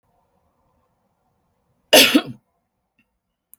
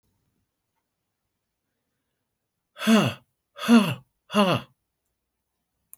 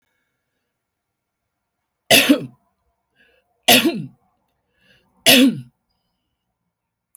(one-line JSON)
{"cough_length": "3.6 s", "cough_amplitude": 30846, "cough_signal_mean_std_ratio": 0.22, "exhalation_length": "6.0 s", "exhalation_amplitude": 17168, "exhalation_signal_mean_std_ratio": 0.29, "three_cough_length": "7.2 s", "three_cough_amplitude": 32768, "three_cough_signal_mean_std_ratio": 0.28, "survey_phase": "beta (2021-08-13 to 2022-03-07)", "age": "65+", "gender": "Female", "wearing_mask": "No", "symptom_none": true, "smoker_status": "Current smoker (1 to 10 cigarettes per day)", "respiratory_condition_asthma": false, "respiratory_condition_other": false, "recruitment_source": "REACT", "submission_delay": "6 days", "covid_test_result": "Negative", "covid_test_method": "RT-qPCR"}